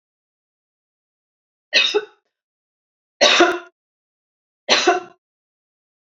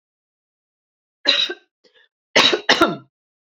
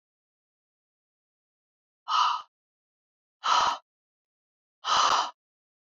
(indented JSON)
{
  "three_cough_length": "6.1 s",
  "three_cough_amplitude": 31384,
  "three_cough_signal_mean_std_ratio": 0.3,
  "cough_length": "3.4 s",
  "cough_amplitude": 31080,
  "cough_signal_mean_std_ratio": 0.34,
  "exhalation_length": "5.9 s",
  "exhalation_amplitude": 9790,
  "exhalation_signal_mean_std_ratio": 0.34,
  "survey_phase": "beta (2021-08-13 to 2022-03-07)",
  "age": "45-64",
  "gender": "Female",
  "wearing_mask": "No",
  "symptom_none": true,
  "symptom_onset": "12 days",
  "smoker_status": "Ex-smoker",
  "respiratory_condition_asthma": false,
  "respiratory_condition_other": false,
  "recruitment_source": "REACT",
  "submission_delay": "4 days",
  "covid_test_result": "Negative",
  "covid_test_method": "RT-qPCR",
  "influenza_a_test_result": "Negative",
  "influenza_b_test_result": "Negative"
}